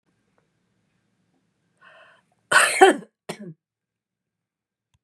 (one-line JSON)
{"cough_length": "5.0 s", "cough_amplitude": 30892, "cough_signal_mean_std_ratio": 0.22, "survey_phase": "beta (2021-08-13 to 2022-03-07)", "age": "65+", "gender": "Female", "wearing_mask": "No", "symptom_none": true, "smoker_status": "Never smoked", "respiratory_condition_asthma": false, "respiratory_condition_other": false, "recruitment_source": "REACT", "submission_delay": "1 day", "covid_test_result": "Negative", "covid_test_method": "RT-qPCR", "influenza_a_test_result": "Unknown/Void", "influenza_b_test_result": "Unknown/Void"}